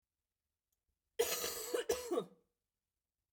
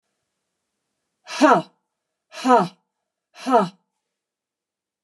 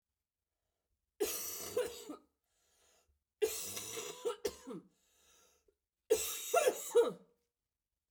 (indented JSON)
{
  "cough_length": "3.3 s",
  "cough_amplitude": 2831,
  "cough_signal_mean_std_ratio": 0.41,
  "exhalation_length": "5.0 s",
  "exhalation_amplitude": 29751,
  "exhalation_signal_mean_std_ratio": 0.29,
  "three_cough_length": "8.1 s",
  "three_cough_amplitude": 3895,
  "three_cough_signal_mean_std_ratio": 0.38,
  "survey_phase": "beta (2021-08-13 to 2022-03-07)",
  "age": "45-64",
  "gender": "Female",
  "wearing_mask": "No",
  "symptom_cough_any": true,
  "symptom_runny_or_blocked_nose": true,
  "symptom_sore_throat": true,
  "symptom_fatigue": true,
  "symptom_headache": true,
  "symptom_change_to_sense_of_smell_or_taste": true,
  "symptom_onset": "4 days",
  "smoker_status": "Never smoked",
  "respiratory_condition_asthma": true,
  "respiratory_condition_other": false,
  "recruitment_source": "Test and Trace",
  "submission_delay": "2 days",
  "covid_test_result": "Positive",
  "covid_test_method": "RT-qPCR",
  "covid_ct_value": 13.7,
  "covid_ct_gene": "ORF1ab gene",
  "covid_ct_mean": 13.9,
  "covid_viral_load": "28000000 copies/ml",
  "covid_viral_load_category": "High viral load (>1M copies/ml)"
}